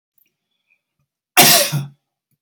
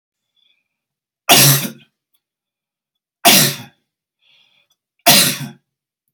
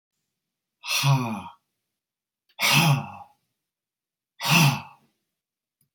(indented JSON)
{
  "cough_length": "2.4 s",
  "cough_amplitude": 32768,
  "cough_signal_mean_std_ratio": 0.33,
  "three_cough_length": "6.1 s",
  "three_cough_amplitude": 32768,
  "three_cough_signal_mean_std_ratio": 0.32,
  "exhalation_length": "5.9 s",
  "exhalation_amplitude": 15306,
  "exhalation_signal_mean_std_ratio": 0.39,
  "survey_phase": "beta (2021-08-13 to 2022-03-07)",
  "age": "45-64",
  "gender": "Male",
  "wearing_mask": "No",
  "symptom_cough_any": true,
  "smoker_status": "Ex-smoker",
  "respiratory_condition_asthma": false,
  "respiratory_condition_other": false,
  "recruitment_source": "REACT",
  "submission_delay": "1 day",
  "covid_test_result": "Negative",
  "covid_test_method": "RT-qPCR",
  "influenza_a_test_result": "Negative",
  "influenza_b_test_result": "Negative"
}